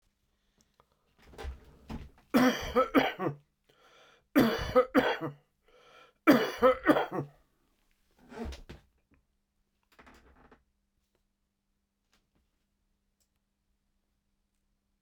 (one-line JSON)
{"three_cough_length": "15.0 s", "three_cough_amplitude": 14060, "three_cough_signal_mean_std_ratio": 0.3, "survey_phase": "beta (2021-08-13 to 2022-03-07)", "age": "65+", "gender": "Male", "wearing_mask": "No", "symptom_none": true, "symptom_onset": "5 days", "smoker_status": "Ex-smoker", "respiratory_condition_asthma": true, "respiratory_condition_other": false, "recruitment_source": "Test and Trace", "submission_delay": "2 days", "covid_test_result": "Positive", "covid_test_method": "RT-qPCR", "covid_ct_value": 21.0, "covid_ct_gene": "ORF1ab gene", "covid_ct_mean": 21.5, "covid_viral_load": "86000 copies/ml", "covid_viral_load_category": "Low viral load (10K-1M copies/ml)"}